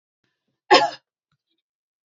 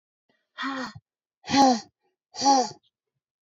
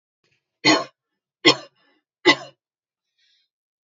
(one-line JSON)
{"cough_length": "2.0 s", "cough_amplitude": 31054, "cough_signal_mean_std_ratio": 0.22, "exhalation_length": "3.4 s", "exhalation_amplitude": 14865, "exhalation_signal_mean_std_ratio": 0.37, "three_cough_length": "3.8 s", "three_cough_amplitude": 28700, "three_cough_signal_mean_std_ratio": 0.24, "survey_phase": "beta (2021-08-13 to 2022-03-07)", "age": "18-44", "gender": "Female", "wearing_mask": "No", "symptom_fatigue": true, "symptom_headache": true, "symptom_onset": "6 days", "smoker_status": "Never smoked", "respiratory_condition_asthma": false, "respiratory_condition_other": false, "recruitment_source": "REACT", "submission_delay": "0 days", "covid_test_result": "Negative", "covid_test_method": "RT-qPCR", "influenza_a_test_result": "Negative", "influenza_b_test_result": "Negative"}